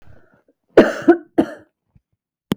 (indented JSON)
{
  "cough_length": "2.6 s",
  "cough_amplitude": 32768,
  "cough_signal_mean_std_ratio": 0.28,
  "survey_phase": "beta (2021-08-13 to 2022-03-07)",
  "age": "45-64",
  "gender": "Female",
  "wearing_mask": "No",
  "symptom_none": true,
  "symptom_onset": "12 days",
  "smoker_status": "Never smoked",
  "respiratory_condition_asthma": false,
  "respiratory_condition_other": false,
  "recruitment_source": "REACT",
  "submission_delay": "6 days",
  "covid_test_result": "Negative",
  "covid_test_method": "RT-qPCR"
}